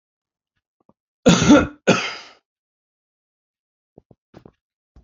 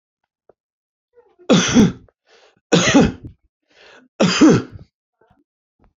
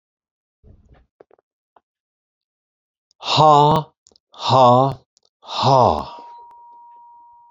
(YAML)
cough_length: 5.0 s
cough_amplitude: 29523
cough_signal_mean_std_ratio: 0.26
three_cough_length: 6.0 s
three_cough_amplitude: 29099
three_cough_signal_mean_std_ratio: 0.37
exhalation_length: 7.5 s
exhalation_amplitude: 29298
exhalation_signal_mean_std_ratio: 0.36
survey_phase: beta (2021-08-13 to 2022-03-07)
age: 65+
gender: Male
wearing_mask: 'No'
symptom_none: true
smoker_status: Never smoked
respiratory_condition_asthma: false
respiratory_condition_other: false
recruitment_source: REACT
submission_delay: 3 days
covid_test_result: Negative
covid_test_method: RT-qPCR
influenza_a_test_result: Negative
influenza_b_test_result: Negative